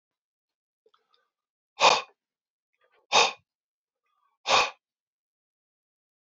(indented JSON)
{
  "exhalation_length": "6.2 s",
  "exhalation_amplitude": 15802,
  "exhalation_signal_mean_std_ratio": 0.23,
  "survey_phase": "beta (2021-08-13 to 2022-03-07)",
  "age": "65+",
  "gender": "Male",
  "wearing_mask": "No",
  "symptom_runny_or_blocked_nose": true,
  "symptom_headache": true,
  "symptom_change_to_sense_of_smell_or_taste": true,
  "symptom_other": true,
  "symptom_onset": "5 days",
  "smoker_status": "Never smoked",
  "respiratory_condition_asthma": false,
  "respiratory_condition_other": false,
  "recruitment_source": "Test and Trace",
  "submission_delay": "2 days",
  "covid_test_result": "Positive",
  "covid_test_method": "RT-qPCR",
  "covid_ct_value": 14.5,
  "covid_ct_gene": "N gene",
  "covid_ct_mean": 14.6,
  "covid_viral_load": "16000000 copies/ml",
  "covid_viral_load_category": "High viral load (>1M copies/ml)"
}